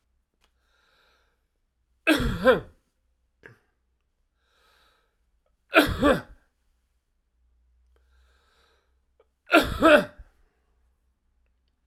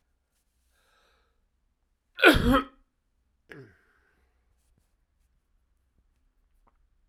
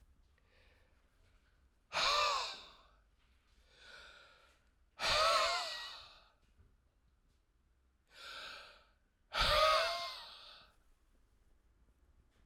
{
  "three_cough_length": "11.9 s",
  "three_cough_amplitude": 23106,
  "three_cough_signal_mean_std_ratio": 0.25,
  "cough_length": "7.1 s",
  "cough_amplitude": 24519,
  "cough_signal_mean_std_ratio": 0.18,
  "exhalation_length": "12.5 s",
  "exhalation_amplitude": 3856,
  "exhalation_signal_mean_std_ratio": 0.38,
  "survey_phase": "beta (2021-08-13 to 2022-03-07)",
  "age": "65+",
  "gender": "Male",
  "wearing_mask": "No",
  "symptom_cough_any": true,
  "symptom_runny_or_blocked_nose": true,
  "smoker_status": "Never smoked",
  "respiratory_condition_asthma": false,
  "respiratory_condition_other": false,
  "recruitment_source": "Test and Trace",
  "submission_delay": "2 days",
  "covid_test_result": "Negative",
  "covid_test_method": "LFT"
}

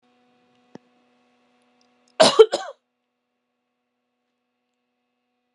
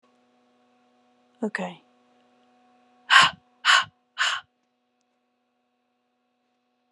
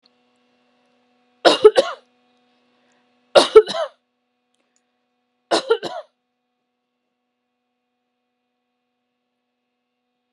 {
  "cough_length": "5.5 s",
  "cough_amplitude": 32704,
  "cough_signal_mean_std_ratio": 0.16,
  "exhalation_length": "6.9 s",
  "exhalation_amplitude": 28002,
  "exhalation_signal_mean_std_ratio": 0.24,
  "three_cough_length": "10.3 s",
  "three_cough_amplitude": 32768,
  "three_cough_signal_mean_std_ratio": 0.2,
  "survey_phase": "beta (2021-08-13 to 2022-03-07)",
  "age": "18-44",
  "gender": "Female",
  "wearing_mask": "No",
  "symptom_none": true,
  "smoker_status": "Never smoked",
  "respiratory_condition_asthma": false,
  "respiratory_condition_other": false,
  "recruitment_source": "REACT",
  "submission_delay": "4 days",
  "covid_test_result": "Negative",
  "covid_test_method": "RT-qPCR"
}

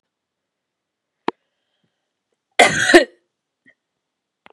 {
  "cough_length": "4.5 s",
  "cough_amplitude": 32768,
  "cough_signal_mean_std_ratio": 0.22,
  "survey_phase": "beta (2021-08-13 to 2022-03-07)",
  "age": "45-64",
  "gender": "Female",
  "wearing_mask": "No",
  "symptom_none": true,
  "smoker_status": "Ex-smoker",
  "respiratory_condition_asthma": false,
  "respiratory_condition_other": false,
  "recruitment_source": "REACT",
  "submission_delay": "2 days",
  "covid_test_result": "Negative",
  "covid_test_method": "RT-qPCR",
  "influenza_a_test_result": "Negative",
  "influenza_b_test_result": "Negative"
}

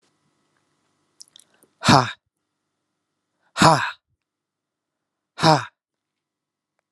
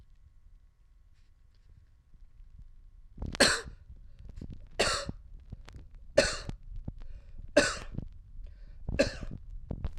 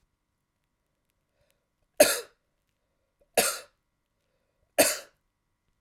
{
  "exhalation_length": "6.9 s",
  "exhalation_amplitude": 32767,
  "exhalation_signal_mean_std_ratio": 0.23,
  "cough_length": "10.0 s",
  "cough_amplitude": 13417,
  "cough_signal_mean_std_ratio": 0.43,
  "three_cough_length": "5.8 s",
  "three_cough_amplitude": 20874,
  "three_cough_signal_mean_std_ratio": 0.21,
  "survey_phase": "alpha (2021-03-01 to 2021-08-12)",
  "age": "45-64",
  "gender": "Male",
  "wearing_mask": "No",
  "symptom_none": true,
  "smoker_status": "Ex-smoker",
  "respiratory_condition_asthma": false,
  "respiratory_condition_other": false,
  "recruitment_source": "REACT",
  "submission_delay": "1 day",
  "covid_test_result": "Negative",
  "covid_test_method": "RT-qPCR"
}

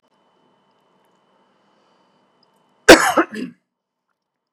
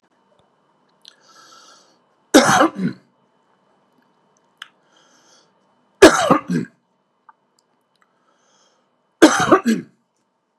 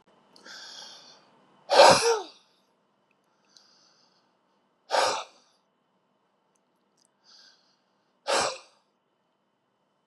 {
  "cough_length": "4.5 s",
  "cough_amplitude": 32768,
  "cough_signal_mean_std_ratio": 0.19,
  "three_cough_length": "10.6 s",
  "three_cough_amplitude": 32768,
  "three_cough_signal_mean_std_ratio": 0.26,
  "exhalation_length": "10.1 s",
  "exhalation_amplitude": 22007,
  "exhalation_signal_mean_std_ratio": 0.24,
  "survey_phase": "beta (2021-08-13 to 2022-03-07)",
  "age": "45-64",
  "gender": "Male",
  "wearing_mask": "No",
  "symptom_none": true,
  "smoker_status": "Never smoked",
  "respiratory_condition_asthma": false,
  "respiratory_condition_other": false,
  "recruitment_source": "REACT",
  "submission_delay": "3 days",
  "covid_test_result": "Negative",
  "covid_test_method": "RT-qPCR",
  "influenza_a_test_result": "Negative",
  "influenza_b_test_result": "Negative"
}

